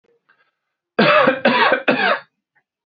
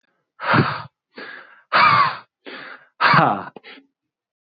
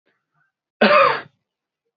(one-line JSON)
{"three_cough_length": "3.0 s", "three_cough_amplitude": 26219, "three_cough_signal_mean_std_ratio": 0.5, "exhalation_length": "4.4 s", "exhalation_amplitude": 27336, "exhalation_signal_mean_std_ratio": 0.44, "cough_length": "2.0 s", "cough_amplitude": 25082, "cough_signal_mean_std_ratio": 0.35, "survey_phase": "beta (2021-08-13 to 2022-03-07)", "age": "18-44", "gender": "Male", "wearing_mask": "No", "symptom_none": true, "smoker_status": "Never smoked", "respiratory_condition_asthma": false, "respiratory_condition_other": false, "recruitment_source": "REACT", "submission_delay": "0 days", "covid_test_result": "Negative", "covid_test_method": "RT-qPCR", "influenza_a_test_result": "Negative", "influenza_b_test_result": "Negative"}